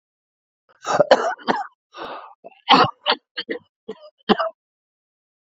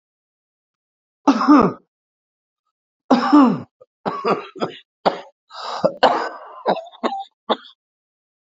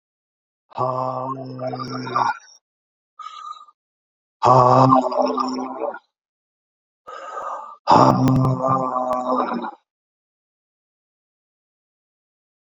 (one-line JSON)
{"cough_length": "5.5 s", "cough_amplitude": 28055, "cough_signal_mean_std_ratio": 0.33, "three_cough_length": "8.5 s", "three_cough_amplitude": 28823, "three_cough_signal_mean_std_ratio": 0.38, "exhalation_length": "12.8 s", "exhalation_amplitude": 31467, "exhalation_signal_mean_std_ratio": 0.45, "survey_phase": "beta (2021-08-13 to 2022-03-07)", "age": "45-64", "gender": "Male", "wearing_mask": "No", "symptom_cough_any": true, "symptom_runny_or_blocked_nose": true, "symptom_fatigue": true, "symptom_fever_high_temperature": true, "smoker_status": "Ex-smoker", "respiratory_condition_asthma": true, "respiratory_condition_other": false, "recruitment_source": "Test and Trace", "submission_delay": "1 day", "covid_test_result": "Positive", "covid_test_method": "RT-qPCR", "covid_ct_value": 17.4, "covid_ct_gene": "ORF1ab gene", "covid_ct_mean": 17.7, "covid_viral_load": "1500000 copies/ml", "covid_viral_load_category": "High viral load (>1M copies/ml)"}